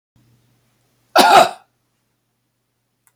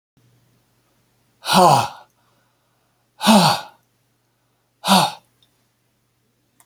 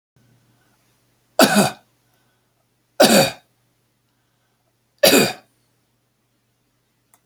{"cough_length": "3.2 s", "cough_amplitude": 31980, "cough_signal_mean_std_ratio": 0.27, "exhalation_length": "6.7 s", "exhalation_amplitude": 32768, "exhalation_signal_mean_std_ratio": 0.31, "three_cough_length": "7.3 s", "three_cough_amplitude": 32768, "three_cough_signal_mean_std_ratio": 0.27, "survey_phase": "beta (2021-08-13 to 2022-03-07)", "age": "65+", "gender": "Male", "wearing_mask": "No", "symptom_none": true, "smoker_status": "Never smoked", "respiratory_condition_asthma": false, "respiratory_condition_other": false, "recruitment_source": "Test and Trace", "submission_delay": "1 day", "covid_test_result": "Negative", "covid_test_method": "RT-qPCR"}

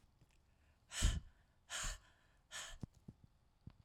{"exhalation_length": "3.8 s", "exhalation_amplitude": 2518, "exhalation_signal_mean_std_ratio": 0.34, "survey_phase": "alpha (2021-03-01 to 2021-08-12)", "age": "45-64", "gender": "Female", "wearing_mask": "No", "symptom_none": true, "smoker_status": "Ex-smoker", "respiratory_condition_asthma": false, "respiratory_condition_other": false, "recruitment_source": "REACT", "submission_delay": "2 days", "covid_test_result": "Negative", "covid_test_method": "RT-qPCR"}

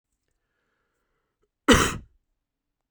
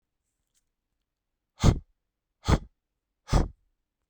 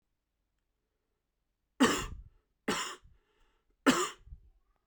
{"cough_length": "2.9 s", "cough_amplitude": 32767, "cough_signal_mean_std_ratio": 0.22, "exhalation_length": "4.1 s", "exhalation_amplitude": 15850, "exhalation_signal_mean_std_ratio": 0.24, "three_cough_length": "4.9 s", "three_cough_amplitude": 9812, "three_cough_signal_mean_std_ratio": 0.29, "survey_phase": "beta (2021-08-13 to 2022-03-07)", "age": "18-44", "gender": "Male", "wearing_mask": "No", "symptom_runny_or_blocked_nose": true, "symptom_shortness_of_breath": true, "symptom_fatigue": true, "symptom_onset": "5 days", "smoker_status": "Never smoked", "respiratory_condition_asthma": false, "respiratory_condition_other": false, "recruitment_source": "Test and Trace", "submission_delay": "2 days", "covid_test_result": "Positive", "covid_test_method": "RT-qPCR", "covid_ct_value": 14.9, "covid_ct_gene": "ORF1ab gene"}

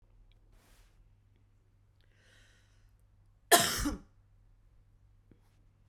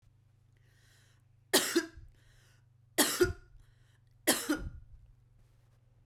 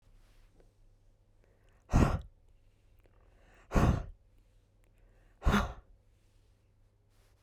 {"cough_length": "5.9 s", "cough_amplitude": 15699, "cough_signal_mean_std_ratio": 0.21, "three_cough_length": "6.1 s", "three_cough_amplitude": 9756, "three_cough_signal_mean_std_ratio": 0.32, "exhalation_length": "7.4 s", "exhalation_amplitude": 8223, "exhalation_signal_mean_std_ratio": 0.28, "survey_phase": "beta (2021-08-13 to 2022-03-07)", "age": "18-44", "gender": "Female", "wearing_mask": "No", "symptom_none": true, "smoker_status": "Never smoked", "respiratory_condition_asthma": false, "respiratory_condition_other": false, "recruitment_source": "REACT", "submission_delay": "1 day", "covid_test_result": "Negative", "covid_test_method": "RT-qPCR"}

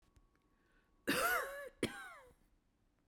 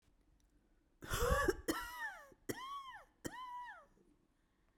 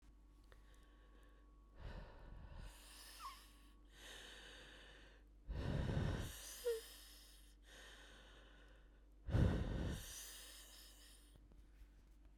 {"cough_length": "3.1 s", "cough_amplitude": 2491, "cough_signal_mean_std_ratio": 0.41, "three_cough_length": "4.8 s", "three_cough_amplitude": 2871, "three_cough_signal_mean_std_ratio": 0.45, "exhalation_length": "12.4 s", "exhalation_amplitude": 1973, "exhalation_signal_mean_std_ratio": 0.49, "survey_phase": "beta (2021-08-13 to 2022-03-07)", "age": "45-64", "gender": "Female", "wearing_mask": "No", "symptom_cough_any": true, "symptom_runny_or_blocked_nose": true, "symptom_shortness_of_breath": true, "symptom_fatigue": true, "symptom_headache": true, "symptom_change_to_sense_of_smell_or_taste": true, "symptom_onset": "2 days", "smoker_status": "Ex-smoker", "respiratory_condition_asthma": false, "respiratory_condition_other": false, "recruitment_source": "Test and Trace", "submission_delay": "2 days", "covid_test_result": "Positive", "covid_test_method": "RT-qPCR"}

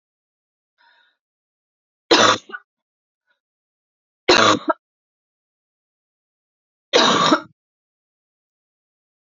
{"three_cough_length": "9.2 s", "three_cough_amplitude": 28323, "three_cough_signal_mean_std_ratio": 0.27, "survey_phase": "alpha (2021-03-01 to 2021-08-12)", "age": "18-44", "gender": "Female", "wearing_mask": "No", "symptom_cough_any": true, "symptom_new_continuous_cough": true, "symptom_fatigue": true, "symptom_fever_high_temperature": true, "symptom_headache": true, "symptom_change_to_sense_of_smell_or_taste": true, "symptom_onset": "3 days", "smoker_status": "Ex-smoker", "respiratory_condition_asthma": false, "respiratory_condition_other": false, "recruitment_source": "Test and Trace", "submission_delay": "2 days", "covid_test_result": "Positive", "covid_test_method": "RT-qPCR", "covid_ct_value": 16.0, "covid_ct_gene": "ORF1ab gene", "covid_ct_mean": 16.4, "covid_viral_load": "4200000 copies/ml", "covid_viral_load_category": "High viral load (>1M copies/ml)"}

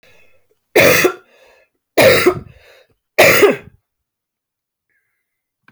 {"three_cough_length": "5.7 s", "three_cough_amplitude": 32768, "three_cough_signal_mean_std_ratio": 0.37, "survey_phase": "beta (2021-08-13 to 2022-03-07)", "age": "45-64", "gender": "Female", "wearing_mask": "No", "symptom_cough_any": true, "symptom_runny_or_blocked_nose": true, "symptom_shortness_of_breath": true, "symptom_sore_throat": true, "symptom_fatigue": true, "symptom_headache": true, "symptom_other": true, "symptom_onset": "2 days", "smoker_status": "Current smoker (1 to 10 cigarettes per day)", "respiratory_condition_asthma": false, "respiratory_condition_other": false, "recruitment_source": "Test and Trace", "submission_delay": "2 days", "covid_test_result": "Positive", "covid_test_method": "LAMP"}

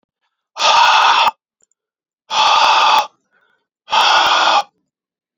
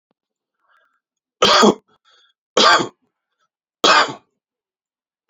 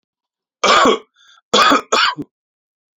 {"exhalation_length": "5.4 s", "exhalation_amplitude": 29647, "exhalation_signal_mean_std_ratio": 0.58, "three_cough_length": "5.3 s", "three_cough_amplitude": 32768, "three_cough_signal_mean_std_ratio": 0.32, "cough_length": "3.0 s", "cough_amplitude": 32767, "cough_signal_mean_std_ratio": 0.45, "survey_phase": "alpha (2021-03-01 to 2021-08-12)", "age": "45-64", "gender": "Male", "wearing_mask": "No", "symptom_abdominal_pain": true, "symptom_diarrhoea": true, "symptom_onset": "4 days", "smoker_status": "Current smoker (e-cigarettes or vapes only)", "respiratory_condition_asthma": false, "respiratory_condition_other": false, "recruitment_source": "Test and Trace", "submission_delay": "3 days", "covid_test_result": "Positive", "covid_test_method": "RT-qPCR", "covid_ct_value": 22.0, "covid_ct_gene": "ORF1ab gene", "covid_ct_mean": 22.1, "covid_viral_load": "58000 copies/ml", "covid_viral_load_category": "Low viral load (10K-1M copies/ml)"}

